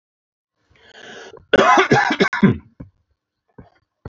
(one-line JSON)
{"cough_length": "4.1 s", "cough_amplitude": 27466, "cough_signal_mean_std_ratio": 0.38, "survey_phase": "alpha (2021-03-01 to 2021-08-12)", "age": "45-64", "gender": "Male", "wearing_mask": "No", "symptom_none": true, "smoker_status": "Ex-smoker", "respiratory_condition_asthma": false, "respiratory_condition_other": false, "recruitment_source": "REACT", "submission_delay": "10 days", "covid_test_result": "Negative", "covid_test_method": "RT-qPCR"}